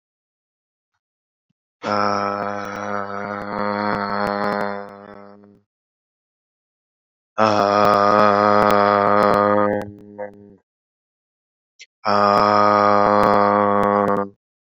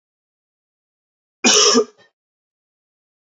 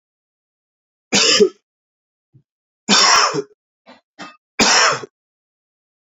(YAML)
exhalation_length: 14.8 s
exhalation_amplitude: 27660
exhalation_signal_mean_std_ratio: 0.51
cough_length: 3.3 s
cough_amplitude: 31358
cough_signal_mean_std_ratio: 0.28
three_cough_length: 6.1 s
three_cough_amplitude: 30810
three_cough_signal_mean_std_ratio: 0.38
survey_phase: beta (2021-08-13 to 2022-03-07)
age: 18-44
gender: Male
wearing_mask: 'No'
symptom_cough_any: true
symptom_runny_or_blocked_nose: true
symptom_abdominal_pain: true
symptom_fatigue: true
symptom_fever_high_temperature: true
symptom_headache: true
symptom_onset: 3 days
smoker_status: Never smoked
respiratory_condition_asthma: false
respiratory_condition_other: false
recruitment_source: Test and Trace
submission_delay: 1 day
covid_test_result: Positive
covid_test_method: ePCR